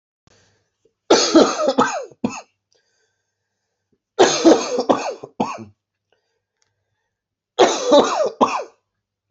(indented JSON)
{
  "three_cough_length": "9.3 s",
  "three_cough_amplitude": 29859,
  "three_cough_signal_mean_std_ratio": 0.4,
  "survey_phase": "beta (2021-08-13 to 2022-03-07)",
  "age": "18-44",
  "gender": "Male",
  "wearing_mask": "No",
  "symptom_cough_any": true,
  "symptom_runny_or_blocked_nose": true,
  "symptom_sore_throat": true,
  "symptom_fatigue": true,
  "symptom_fever_high_temperature": true,
  "symptom_headache": true,
  "smoker_status": "Never smoked",
  "respiratory_condition_asthma": false,
  "respiratory_condition_other": false,
  "recruitment_source": "Test and Trace",
  "submission_delay": "2 days",
  "covid_test_result": "Positive",
  "covid_test_method": "RT-qPCR",
  "covid_ct_value": 25.7,
  "covid_ct_gene": "ORF1ab gene"
}